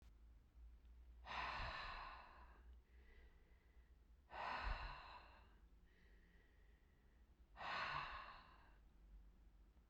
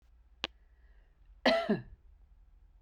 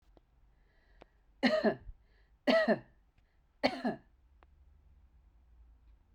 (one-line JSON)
{"exhalation_length": "9.9 s", "exhalation_amplitude": 587, "exhalation_signal_mean_std_ratio": 0.61, "cough_length": "2.8 s", "cough_amplitude": 9111, "cough_signal_mean_std_ratio": 0.32, "three_cough_length": "6.1 s", "three_cough_amplitude": 7088, "three_cough_signal_mean_std_ratio": 0.32, "survey_phase": "beta (2021-08-13 to 2022-03-07)", "age": "45-64", "gender": "Female", "wearing_mask": "No", "symptom_cough_any": true, "symptom_runny_or_blocked_nose": true, "symptom_sore_throat": true, "smoker_status": "Never smoked", "respiratory_condition_asthma": false, "respiratory_condition_other": false, "recruitment_source": "REACT", "submission_delay": "1 day", "covid_test_result": "Negative", "covid_test_method": "RT-qPCR"}